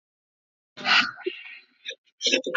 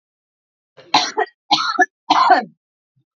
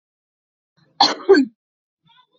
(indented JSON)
{
  "exhalation_length": "2.6 s",
  "exhalation_amplitude": 21607,
  "exhalation_signal_mean_std_ratio": 0.4,
  "three_cough_length": "3.2 s",
  "three_cough_amplitude": 30291,
  "three_cough_signal_mean_std_ratio": 0.41,
  "cough_length": "2.4 s",
  "cough_amplitude": 29183,
  "cough_signal_mean_std_ratio": 0.28,
  "survey_phase": "alpha (2021-03-01 to 2021-08-12)",
  "age": "18-44",
  "gender": "Female",
  "wearing_mask": "No",
  "symptom_diarrhoea": true,
  "symptom_fatigue": true,
  "smoker_status": "Current smoker (1 to 10 cigarettes per day)",
  "respiratory_condition_asthma": true,
  "respiratory_condition_other": false,
  "recruitment_source": "REACT",
  "submission_delay": "2 days",
  "covid_test_result": "Negative",
  "covid_test_method": "RT-qPCR"
}